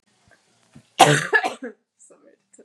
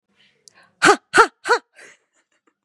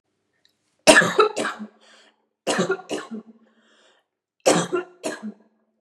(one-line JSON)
{"cough_length": "2.6 s", "cough_amplitude": 32768, "cough_signal_mean_std_ratio": 0.3, "exhalation_length": "2.6 s", "exhalation_amplitude": 32767, "exhalation_signal_mean_std_ratio": 0.28, "three_cough_length": "5.8 s", "three_cough_amplitude": 32767, "three_cough_signal_mean_std_ratio": 0.35, "survey_phase": "beta (2021-08-13 to 2022-03-07)", "age": "18-44", "gender": "Female", "wearing_mask": "Yes", "symptom_cough_any": true, "symptom_sore_throat": true, "symptom_headache": true, "symptom_onset": "6 days", "smoker_status": "Never smoked", "respiratory_condition_asthma": false, "respiratory_condition_other": false, "recruitment_source": "Test and Trace", "submission_delay": "4 days", "covid_test_method": "RT-qPCR", "covid_ct_value": 27.4, "covid_ct_gene": "ORF1ab gene", "covid_ct_mean": 29.9, "covid_viral_load": "160 copies/ml", "covid_viral_load_category": "Minimal viral load (< 10K copies/ml)"}